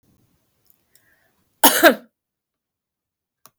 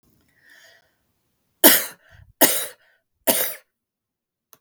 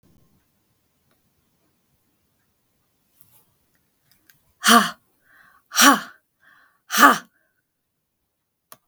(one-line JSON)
{"cough_length": "3.6 s", "cough_amplitude": 32768, "cough_signal_mean_std_ratio": 0.21, "three_cough_length": "4.6 s", "three_cough_amplitude": 32768, "three_cough_signal_mean_std_ratio": 0.27, "exhalation_length": "8.9 s", "exhalation_amplitude": 32766, "exhalation_signal_mean_std_ratio": 0.22, "survey_phase": "beta (2021-08-13 to 2022-03-07)", "age": "45-64", "gender": "Female", "wearing_mask": "No", "symptom_none": true, "smoker_status": "Never smoked", "respiratory_condition_asthma": false, "respiratory_condition_other": false, "recruitment_source": "REACT", "submission_delay": "2 days", "covid_test_result": "Negative", "covid_test_method": "RT-qPCR"}